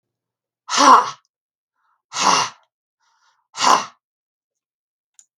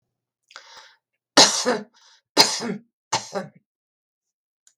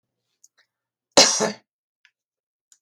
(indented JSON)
{
  "exhalation_length": "5.4 s",
  "exhalation_amplitude": 32768,
  "exhalation_signal_mean_std_ratio": 0.31,
  "three_cough_length": "4.8 s",
  "three_cough_amplitude": 32768,
  "three_cough_signal_mean_std_ratio": 0.29,
  "cough_length": "2.8 s",
  "cough_amplitude": 32768,
  "cough_signal_mean_std_ratio": 0.23,
  "survey_phase": "beta (2021-08-13 to 2022-03-07)",
  "age": "65+",
  "gender": "Female",
  "wearing_mask": "No",
  "symptom_none": true,
  "smoker_status": "Ex-smoker",
  "respiratory_condition_asthma": false,
  "respiratory_condition_other": false,
  "recruitment_source": "REACT",
  "submission_delay": "2 days",
  "covid_test_result": "Negative",
  "covid_test_method": "RT-qPCR",
  "influenza_a_test_result": "Negative",
  "influenza_b_test_result": "Negative"
}